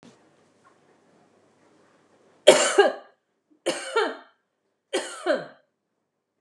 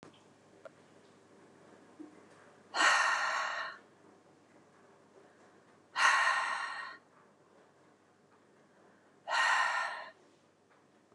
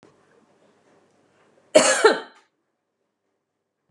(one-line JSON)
{"three_cough_length": "6.4 s", "three_cough_amplitude": 32768, "three_cough_signal_mean_std_ratio": 0.28, "exhalation_length": "11.1 s", "exhalation_amplitude": 7935, "exhalation_signal_mean_std_ratio": 0.41, "cough_length": "3.9 s", "cough_amplitude": 30621, "cough_signal_mean_std_ratio": 0.24, "survey_phase": "beta (2021-08-13 to 2022-03-07)", "age": "45-64", "gender": "Female", "wearing_mask": "No", "symptom_none": true, "smoker_status": "Ex-smoker", "respiratory_condition_asthma": false, "respiratory_condition_other": false, "recruitment_source": "REACT", "submission_delay": "1 day", "covid_test_result": "Negative", "covid_test_method": "RT-qPCR", "influenza_a_test_result": "Negative", "influenza_b_test_result": "Negative"}